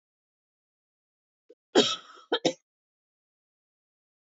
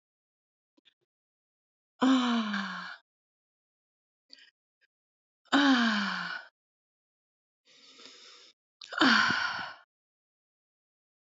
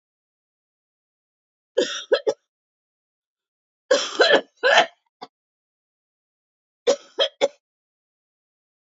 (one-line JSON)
{"cough_length": "4.3 s", "cough_amplitude": 15425, "cough_signal_mean_std_ratio": 0.21, "exhalation_length": "11.3 s", "exhalation_amplitude": 11997, "exhalation_signal_mean_std_ratio": 0.35, "three_cough_length": "8.9 s", "three_cough_amplitude": 28288, "three_cough_signal_mean_std_ratio": 0.28, "survey_phase": "beta (2021-08-13 to 2022-03-07)", "age": "65+", "gender": "Female", "wearing_mask": "No", "symptom_cough_any": true, "symptom_new_continuous_cough": true, "symptom_change_to_sense_of_smell_or_taste": true, "symptom_loss_of_taste": true, "symptom_onset": "9 days", "smoker_status": "Never smoked", "respiratory_condition_asthma": false, "respiratory_condition_other": false, "recruitment_source": "Test and Trace", "submission_delay": "2 days", "covid_test_result": "Positive", "covid_test_method": "RT-qPCR"}